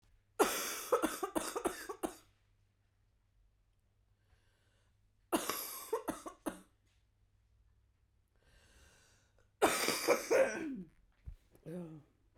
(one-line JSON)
{"three_cough_length": "12.4 s", "three_cough_amplitude": 5905, "three_cough_signal_mean_std_ratio": 0.38, "survey_phase": "beta (2021-08-13 to 2022-03-07)", "age": "45-64", "gender": "Female", "wearing_mask": "No", "symptom_cough_any": true, "symptom_new_continuous_cough": true, "symptom_fatigue": true, "symptom_fever_high_temperature": true, "symptom_headache": true, "symptom_onset": "3 days", "smoker_status": "Never smoked", "respiratory_condition_asthma": false, "respiratory_condition_other": false, "recruitment_source": "Test and Trace", "submission_delay": "2 days", "covid_test_result": "Positive", "covid_test_method": "RT-qPCR", "covid_ct_value": 31.3, "covid_ct_gene": "ORF1ab gene", "covid_ct_mean": 32.0, "covid_viral_load": "33 copies/ml", "covid_viral_load_category": "Minimal viral load (< 10K copies/ml)"}